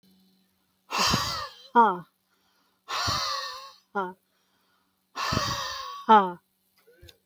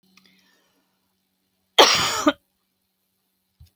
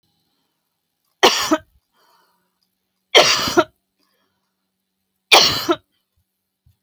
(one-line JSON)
{"exhalation_length": "7.3 s", "exhalation_amplitude": 16906, "exhalation_signal_mean_std_ratio": 0.4, "cough_length": "3.8 s", "cough_amplitude": 32768, "cough_signal_mean_std_ratio": 0.25, "three_cough_length": "6.8 s", "three_cough_amplitude": 32768, "three_cough_signal_mean_std_ratio": 0.3, "survey_phase": "beta (2021-08-13 to 2022-03-07)", "age": "18-44", "gender": "Female", "wearing_mask": "No", "symptom_cough_any": true, "symptom_shortness_of_breath": true, "symptom_sore_throat": true, "symptom_fatigue": true, "symptom_headache": true, "symptom_change_to_sense_of_smell_or_taste": true, "symptom_onset": "12 days", "smoker_status": "Never smoked", "respiratory_condition_asthma": false, "respiratory_condition_other": false, "recruitment_source": "REACT", "submission_delay": "1 day", "covid_test_result": "Negative", "covid_test_method": "RT-qPCR", "influenza_a_test_result": "Negative", "influenza_b_test_result": "Negative"}